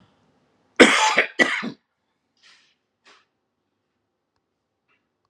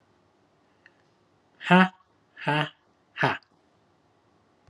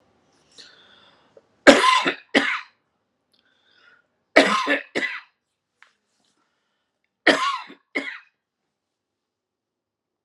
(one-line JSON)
{"cough_length": "5.3 s", "cough_amplitude": 32768, "cough_signal_mean_std_ratio": 0.25, "exhalation_length": "4.7 s", "exhalation_amplitude": 25717, "exhalation_signal_mean_std_ratio": 0.25, "three_cough_length": "10.2 s", "three_cough_amplitude": 32768, "three_cough_signal_mean_std_ratio": 0.28, "survey_phase": "alpha (2021-03-01 to 2021-08-12)", "age": "45-64", "gender": "Male", "wearing_mask": "No", "symptom_none": true, "smoker_status": "Never smoked", "respiratory_condition_asthma": false, "respiratory_condition_other": false, "recruitment_source": "Test and Trace", "submission_delay": "0 days", "covid_test_result": "Negative", "covid_test_method": "LFT"}